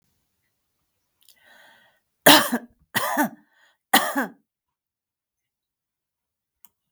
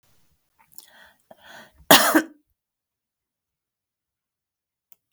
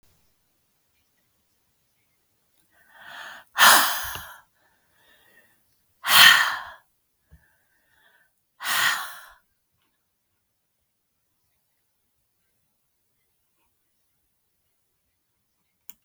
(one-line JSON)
{"three_cough_length": "6.9 s", "three_cough_amplitude": 32768, "three_cough_signal_mean_std_ratio": 0.24, "cough_length": "5.1 s", "cough_amplitude": 32766, "cough_signal_mean_std_ratio": 0.19, "exhalation_length": "16.0 s", "exhalation_amplitude": 32768, "exhalation_signal_mean_std_ratio": 0.21, "survey_phase": "beta (2021-08-13 to 2022-03-07)", "age": "65+", "gender": "Female", "wearing_mask": "No", "symptom_none": true, "smoker_status": "Never smoked", "respiratory_condition_asthma": false, "respiratory_condition_other": false, "recruitment_source": "REACT", "submission_delay": "2 days", "covid_test_result": "Negative", "covid_test_method": "RT-qPCR", "influenza_a_test_result": "Negative", "influenza_b_test_result": "Negative"}